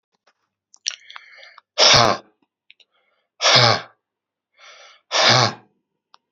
{"exhalation_length": "6.3 s", "exhalation_amplitude": 32767, "exhalation_signal_mean_std_ratio": 0.34, "survey_phase": "beta (2021-08-13 to 2022-03-07)", "age": "18-44", "gender": "Male", "wearing_mask": "No", "symptom_cough_any": true, "symptom_new_continuous_cough": true, "symptom_runny_or_blocked_nose": true, "symptom_shortness_of_breath": true, "symptom_fatigue": true, "symptom_headache": true, "symptom_onset": "2 days", "smoker_status": "Ex-smoker", "respiratory_condition_asthma": false, "respiratory_condition_other": false, "recruitment_source": "Test and Trace", "submission_delay": "1 day", "covid_test_result": "Positive", "covid_test_method": "RT-qPCR", "covid_ct_value": 20.5, "covid_ct_gene": "ORF1ab gene"}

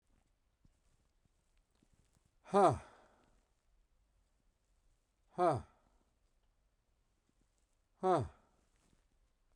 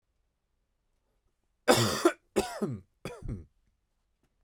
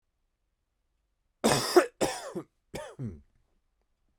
{"exhalation_length": "9.6 s", "exhalation_amplitude": 5921, "exhalation_signal_mean_std_ratio": 0.22, "three_cough_length": "4.4 s", "three_cough_amplitude": 13667, "three_cough_signal_mean_std_ratio": 0.31, "cough_length": "4.2 s", "cough_amplitude": 13345, "cough_signal_mean_std_ratio": 0.3, "survey_phase": "beta (2021-08-13 to 2022-03-07)", "age": "18-44", "gender": "Male", "wearing_mask": "No", "symptom_none": true, "smoker_status": "Prefer not to say", "respiratory_condition_asthma": false, "respiratory_condition_other": false, "recruitment_source": "REACT", "submission_delay": "1 day", "covid_test_result": "Negative", "covid_test_method": "RT-qPCR", "influenza_a_test_result": "Unknown/Void", "influenza_b_test_result": "Unknown/Void"}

